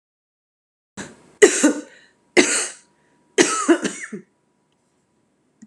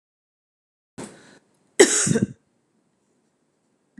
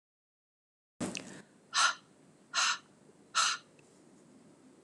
{"three_cough_length": "5.7 s", "three_cough_amplitude": 32768, "three_cough_signal_mean_std_ratio": 0.32, "cough_length": "4.0 s", "cough_amplitude": 32688, "cough_signal_mean_std_ratio": 0.24, "exhalation_length": "4.8 s", "exhalation_amplitude": 5632, "exhalation_signal_mean_std_ratio": 0.35, "survey_phase": "beta (2021-08-13 to 2022-03-07)", "age": "45-64", "gender": "Female", "wearing_mask": "No", "symptom_cough_any": true, "symptom_runny_or_blocked_nose": true, "symptom_sore_throat": true, "symptom_onset": "3 days", "smoker_status": "Ex-smoker", "respiratory_condition_asthma": false, "respiratory_condition_other": false, "recruitment_source": "REACT", "submission_delay": "2 days", "covid_test_result": "Positive", "covid_test_method": "RT-qPCR", "covid_ct_value": 18.9, "covid_ct_gene": "E gene", "influenza_a_test_result": "Negative", "influenza_b_test_result": "Negative"}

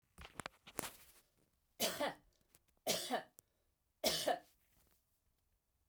{"three_cough_length": "5.9 s", "three_cough_amplitude": 6554, "three_cough_signal_mean_std_ratio": 0.35, "survey_phase": "beta (2021-08-13 to 2022-03-07)", "age": "45-64", "gender": "Female", "wearing_mask": "No", "symptom_runny_or_blocked_nose": true, "smoker_status": "Never smoked", "respiratory_condition_asthma": false, "respiratory_condition_other": true, "recruitment_source": "REACT", "submission_delay": "1 day", "covid_test_result": "Negative", "covid_test_method": "RT-qPCR"}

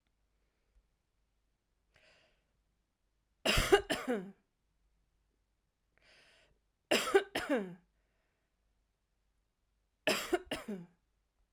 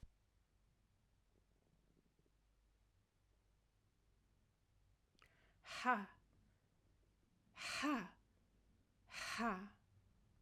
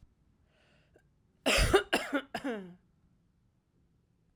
{"three_cough_length": "11.5 s", "three_cough_amplitude": 9169, "three_cough_signal_mean_std_ratio": 0.27, "exhalation_length": "10.4 s", "exhalation_amplitude": 2429, "exhalation_signal_mean_std_ratio": 0.3, "cough_length": "4.4 s", "cough_amplitude": 9546, "cough_signal_mean_std_ratio": 0.33, "survey_phase": "alpha (2021-03-01 to 2021-08-12)", "age": "45-64", "gender": "Female", "wearing_mask": "No", "symptom_cough_any": true, "symptom_fatigue": true, "symptom_headache": true, "symptom_change_to_sense_of_smell_or_taste": true, "symptom_loss_of_taste": true, "symptom_onset": "5 days", "smoker_status": "Never smoked", "respiratory_condition_asthma": false, "respiratory_condition_other": false, "recruitment_source": "Test and Trace", "submission_delay": "2 days", "covid_test_result": "Positive", "covid_test_method": "RT-qPCR", "covid_ct_value": 17.9, "covid_ct_gene": "ORF1ab gene", "covid_ct_mean": 19.2, "covid_viral_load": "490000 copies/ml", "covid_viral_load_category": "Low viral load (10K-1M copies/ml)"}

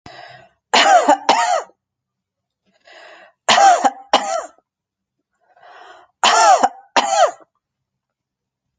{"three_cough_length": "8.8 s", "three_cough_amplitude": 30940, "three_cough_signal_mean_std_ratio": 0.41, "survey_phase": "alpha (2021-03-01 to 2021-08-12)", "age": "45-64", "gender": "Female", "wearing_mask": "No", "symptom_none": true, "smoker_status": "Never smoked", "respiratory_condition_asthma": false, "respiratory_condition_other": false, "recruitment_source": "REACT", "submission_delay": "2 days", "covid_test_result": "Negative", "covid_test_method": "RT-qPCR"}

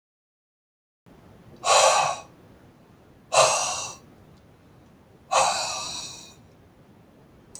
{"exhalation_length": "7.6 s", "exhalation_amplitude": 19949, "exhalation_signal_mean_std_ratio": 0.39, "survey_phase": "beta (2021-08-13 to 2022-03-07)", "age": "45-64", "gender": "Male", "wearing_mask": "No", "symptom_cough_any": true, "symptom_runny_or_blocked_nose": true, "symptom_sore_throat": true, "symptom_onset": "2 days", "smoker_status": "Ex-smoker", "respiratory_condition_asthma": false, "respiratory_condition_other": false, "recruitment_source": "Test and Trace", "submission_delay": "1 day", "covid_test_result": "Positive", "covid_test_method": "RT-qPCR", "covid_ct_value": 33.7, "covid_ct_gene": "N gene"}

